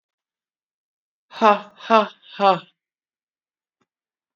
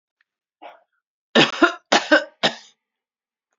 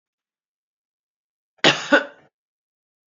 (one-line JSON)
{"exhalation_length": "4.4 s", "exhalation_amplitude": 26967, "exhalation_signal_mean_std_ratio": 0.24, "three_cough_length": "3.6 s", "three_cough_amplitude": 32767, "three_cough_signal_mean_std_ratio": 0.3, "cough_length": "3.1 s", "cough_amplitude": 27563, "cough_signal_mean_std_ratio": 0.22, "survey_phase": "beta (2021-08-13 to 2022-03-07)", "age": "65+", "gender": "Female", "wearing_mask": "No", "symptom_cough_any": true, "symptom_runny_or_blocked_nose": true, "symptom_fatigue": true, "symptom_headache": true, "symptom_change_to_sense_of_smell_or_taste": true, "symptom_onset": "2 days", "smoker_status": "Never smoked", "respiratory_condition_asthma": false, "respiratory_condition_other": false, "recruitment_source": "Test and Trace", "submission_delay": "1 day", "covid_test_result": "Positive", "covid_test_method": "RT-qPCR", "covid_ct_value": 23.9, "covid_ct_gene": "ORF1ab gene", "covid_ct_mean": 24.7, "covid_viral_load": "8100 copies/ml", "covid_viral_load_category": "Minimal viral load (< 10K copies/ml)"}